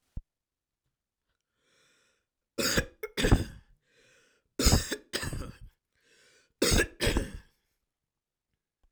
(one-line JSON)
{"three_cough_length": "8.9 s", "three_cough_amplitude": 12758, "three_cough_signal_mean_std_ratio": 0.33, "survey_phase": "alpha (2021-03-01 to 2021-08-12)", "age": "45-64", "gender": "Male", "wearing_mask": "No", "symptom_fatigue": true, "smoker_status": "Never smoked", "respiratory_condition_asthma": false, "respiratory_condition_other": false, "recruitment_source": "Test and Trace", "submission_delay": "2 days", "covid_test_result": "Positive", "covid_test_method": "RT-qPCR", "covid_ct_value": 35.5, "covid_ct_gene": "N gene"}